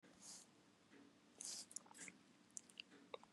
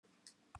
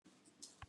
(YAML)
exhalation_length: 3.3 s
exhalation_amplitude: 1429
exhalation_signal_mean_std_ratio: 0.52
cough_length: 0.6 s
cough_amplitude: 463
cough_signal_mean_std_ratio: 0.48
three_cough_length: 0.7 s
three_cough_amplitude: 508
three_cough_signal_mean_std_ratio: 0.59
survey_phase: beta (2021-08-13 to 2022-03-07)
age: 65+
gender: Male
wearing_mask: 'No'
symptom_none: true
smoker_status: Never smoked
respiratory_condition_asthma: false
respiratory_condition_other: false
recruitment_source: REACT
submission_delay: 4 days
covid_test_result: Negative
covid_test_method: RT-qPCR
influenza_a_test_result: Negative
influenza_b_test_result: Negative